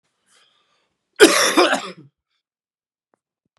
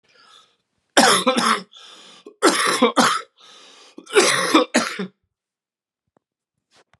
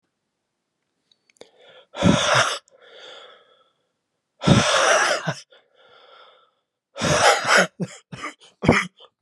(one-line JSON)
{"cough_length": "3.6 s", "cough_amplitude": 32768, "cough_signal_mean_std_ratio": 0.29, "three_cough_length": "7.0 s", "three_cough_amplitude": 32767, "three_cough_signal_mean_std_ratio": 0.43, "exhalation_length": "9.2 s", "exhalation_amplitude": 31257, "exhalation_signal_mean_std_ratio": 0.42, "survey_phase": "beta (2021-08-13 to 2022-03-07)", "age": "45-64", "gender": "Male", "wearing_mask": "No", "symptom_cough_any": true, "symptom_new_continuous_cough": true, "symptom_runny_or_blocked_nose": true, "symptom_fever_high_temperature": true, "symptom_change_to_sense_of_smell_or_taste": true, "symptom_loss_of_taste": true, "symptom_onset": "7 days", "smoker_status": "Never smoked", "respiratory_condition_asthma": false, "respiratory_condition_other": false, "recruitment_source": "Test and Trace", "submission_delay": "1 day", "covid_test_result": "Positive", "covid_test_method": "RT-qPCR", "covid_ct_value": 14.6, "covid_ct_gene": "ORF1ab gene", "covid_ct_mean": 14.9, "covid_viral_load": "13000000 copies/ml", "covid_viral_load_category": "High viral load (>1M copies/ml)"}